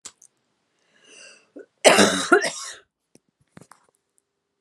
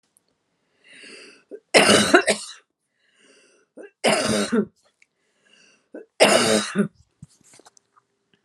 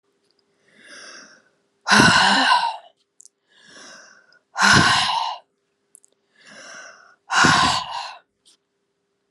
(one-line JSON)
{"cough_length": "4.6 s", "cough_amplitude": 32768, "cough_signal_mean_std_ratio": 0.28, "three_cough_length": "8.4 s", "three_cough_amplitude": 32713, "three_cough_signal_mean_std_ratio": 0.36, "exhalation_length": "9.3 s", "exhalation_amplitude": 32619, "exhalation_signal_mean_std_ratio": 0.41, "survey_phase": "alpha (2021-03-01 to 2021-08-12)", "age": "65+", "gender": "Female", "wearing_mask": "No", "symptom_none": true, "smoker_status": "Never smoked", "respiratory_condition_asthma": false, "respiratory_condition_other": false, "recruitment_source": "REACT", "submission_delay": "1 day", "covid_test_result": "Negative", "covid_test_method": "RT-qPCR"}